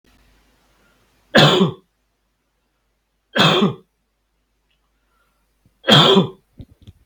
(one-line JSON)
{"three_cough_length": "7.1 s", "three_cough_amplitude": 32768, "three_cough_signal_mean_std_ratio": 0.32, "survey_phase": "beta (2021-08-13 to 2022-03-07)", "age": "18-44", "gender": "Male", "wearing_mask": "No", "symptom_none": true, "smoker_status": "Never smoked", "respiratory_condition_asthma": false, "respiratory_condition_other": false, "recruitment_source": "REACT", "submission_delay": "0 days", "covid_test_result": "Negative", "covid_test_method": "RT-qPCR", "covid_ct_value": 42.0, "covid_ct_gene": "N gene"}